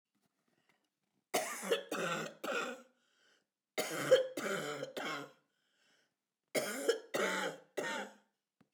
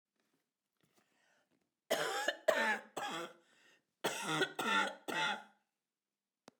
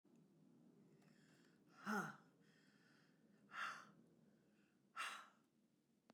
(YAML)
three_cough_length: 8.7 s
three_cough_amplitude: 6115
three_cough_signal_mean_std_ratio: 0.48
cough_length: 6.6 s
cough_amplitude: 5128
cough_signal_mean_std_ratio: 0.45
exhalation_length: 6.1 s
exhalation_amplitude: 757
exhalation_signal_mean_std_ratio: 0.38
survey_phase: beta (2021-08-13 to 2022-03-07)
age: 65+
gender: Female
wearing_mask: 'No'
symptom_cough_any: true
smoker_status: Ex-smoker
respiratory_condition_asthma: false
respiratory_condition_other: false
recruitment_source: Test and Trace
submission_delay: -1 day
covid_test_result: Negative
covid_test_method: LFT